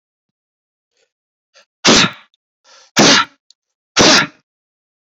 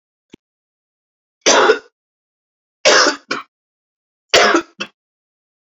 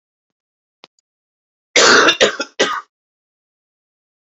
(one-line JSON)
{"exhalation_length": "5.1 s", "exhalation_amplitude": 32768, "exhalation_signal_mean_std_ratio": 0.34, "three_cough_length": "5.6 s", "three_cough_amplitude": 31876, "three_cough_signal_mean_std_ratio": 0.34, "cough_length": "4.4 s", "cough_amplitude": 32129, "cough_signal_mean_std_ratio": 0.32, "survey_phase": "beta (2021-08-13 to 2022-03-07)", "age": "18-44", "gender": "Male", "wearing_mask": "No", "symptom_cough_any": true, "symptom_runny_or_blocked_nose": true, "symptom_shortness_of_breath": true, "symptom_fatigue": true, "symptom_change_to_sense_of_smell_or_taste": true, "symptom_onset": "9 days", "smoker_status": "Never smoked", "respiratory_condition_asthma": false, "respiratory_condition_other": false, "recruitment_source": "Test and Trace", "submission_delay": "2 days", "covid_test_result": "Positive", "covid_test_method": "RT-qPCR"}